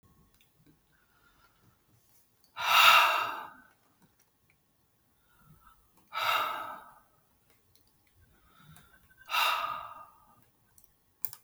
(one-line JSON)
{"exhalation_length": "11.4 s", "exhalation_amplitude": 14187, "exhalation_signal_mean_std_ratio": 0.3, "survey_phase": "beta (2021-08-13 to 2022-03-07)", "age": "65+", "gender": "Male", "wearing_mask": "No", "symptom_none": true, "smoker_status": "Never smoked", "respiratory_condition_asthma": false, "respiratory_condition_other": false, "recruitment_source": "REACT", "submission_delay": "1 day", "covid_test_result": "Negative", "covid_test_method": "RT-qPCR"}